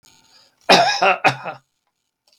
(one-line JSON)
{"cough_length": "2.4 s", "cough_amplitude": 32768, "cough_signal_mean_std_ratio": 0.39, "survey_phase": "beta (2021-08-13 to 2022-03-07)", "age": "65+", "gender": "Male", "wearing_mask": "No", "symptom_none": true, "smoker_status": "Ex-smoker", "respiratory_condition_asthma": true, "respiratory_condition_other": false, "recruitment_source": "REACT", "submission_delay": "1 day", "covid_test_result": "Negative", "covid_test_method": "RT-qPCR", "influenza_a_test_result": "Unknown/Void", "influenza_b_test_result": "Unknown/Void"}